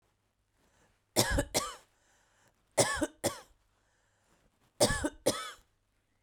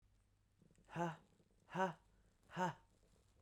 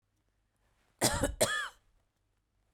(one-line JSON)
{"three_cough_length": "6.2 s", "three_cough_amplitude": 11337, "three_cough_signal_mean_std_ratio": 0.34, "exhalation_length": "3.4 s", "exhalation_amplitude": 1637, "exhalation_signal_mean_std_ratio": 0.37, "cough_length": "2.7 s", "cough_amplitude": 8286, "cough_signal_mean_std_ratio": 0.35, "survey_phase": "beta (2021-08-13 to 2022-03-07)", "age": "45-64", "gender": "Female", "wearing_mask": "No", "symptom_sore_throat": true, "symptom_fatigue": true, "symptom_headache": true, "smoker_status": "Never smoked", "respiratory_condition_asthma": false, "respiratory_condition_other": false, "recruitment_source": "Test and Trace", "submission_delay": "-1 day", "covid_test_result": "Negative", "covid_test_method": "LFT"}